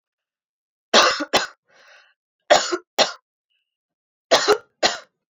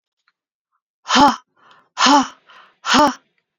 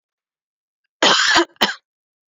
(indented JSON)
{
  "three_cough_length": "5.3 s",
  "three_cough_amplitude": 29348,
  "three_cough_signal_mean_std_ratio": 0.34,
  "exhalation_length": "3.6 s",
  "exhalation_amplitude": 28965,
  "exhalation_signal_mean_std_ratio": 0.39,
  "cough_length": "2.3 s",
  "cough_amplitude": 29826,
  "cough_signal_mean_std_ratio": 0.39,
  "survey_phase": "alpha (2021-03-01 to 2021-08-12)",
  "age": "18-44",
  "gender": "Female",
  "wearing_mask": "No",
  "symptom_cough_any": true,
  "symptom_shortness_of_breath": true,
  "symptom_fatigue": true,
  "symptom_headache": true,
  "symptom_change_to_sense_of_smell_or_taste": true,
  "symptom_loss_of_taste": true,
  "symptom_onset": "2 days",
  "smoker_status": "Never smoked",
  "respiratory_condition_asthma": false,
  "respiratory_condition_other": false,
  "recruitment_source": "Test and Trace",
  "submission_delay": "1 day",
  "covid_test_result": "Positive",
  "covid_test_method": "RT-qPCR"
}